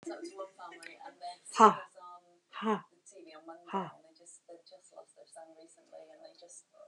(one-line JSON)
{"exhalation_length": "6.9 s", "exhalation_amplitude": 16357, "exhalation_signal_mean_std_ratio": 0.25, "survey_phase": "beta (2021-08-13 to 2022-03-07)", "age": "45-64", "gender": "Female", "wearing_mask": "No", "symptom_none": true, "smoker_status": "Never smoked", "respiratory_condition_asthma": false, "respiratory_condition_other": false, "recruitment_source": "REACT", "submission_delay": "2 days", "covid_test_result": "Negative", "covid_test_method": "RT-qPCR"}